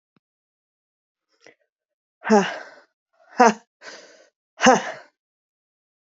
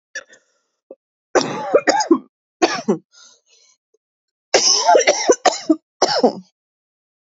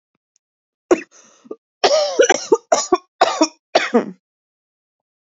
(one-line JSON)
{"exhalation_length": "6.1 s", "exhalation_amplitude": 28042, "exhalation_signal_mean_std_ratio": 0.23, "three_cough_length": "7.3 s", "three_cough_amplitude": 31055, "three_cough_signal_mean_std_ratio": 0.41, "cough_length": "5.2 s", "cough_amplitude": 31815, "cough_signal_mean_std_ratio": 0.38, "survey_phase": "beta (2021-08-13 to 2022-03-07)", "age": "18-44", "gender": "Female", "wearing_mask": "No", "symptom_cough_any": true, "symptom_new_continuous_cough": true, "symptom_runny_or_blocked_nose": true, "symptom_shortness_of_breath": true, "symptom_fatigue": true, "symptom_onset": "5 days", "smoker_status": "Never smoked", "respiratory_condition_asthma": true, "respiratory_condition_other": false, "recruitment_source": "Test and Trace", "submission_delay": "2 days", "covid_test_result": "Positive", "covid_test_method": "RT-qPCR", "covid_ct_value": 18.8, "covid_ct_gene": "N gene"}